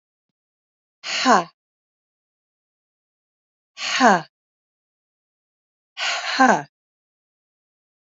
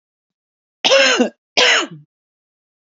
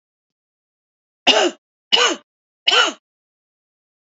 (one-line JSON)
{"exhalation_length": "8.1 s", "exhalation_amplitude": 27894, "exhalation_signal_mean_std_ratio": 0.27, "cough_length": "2.8 s", "cough_amplitude": 30613, "cough_signal_mean_std_ratio": 0.43, "three_cough_length": "4.2 s", "three_cough_amplitude": 29076, "three_cough_signal_mean_std_ratio": 0.32, "survey_phase": "alpha (2021-03-01 to 2021-08-12)", "age": "45-64", "gender": "Female", "wearing_mask": "No", "symptom_cough_any": true, "symptom_abdominal_pain": true, "symptom_fatigue": true, "symptom_fever_high_temperature": true, "symptom_onset": "4 days", "smoker_status": "Ex-smoker", "respiratory_condition_asthma": false, "respiratory_condition_other": false, "recruitment_source": "Test and Trace", "submission_delay": "1 day", "covid_test_result": "Positive", "covid_test_method": "RT-qPCR", "covid_ct_value": 37.6, "covid_ct_gene": "ORF1ab gene"}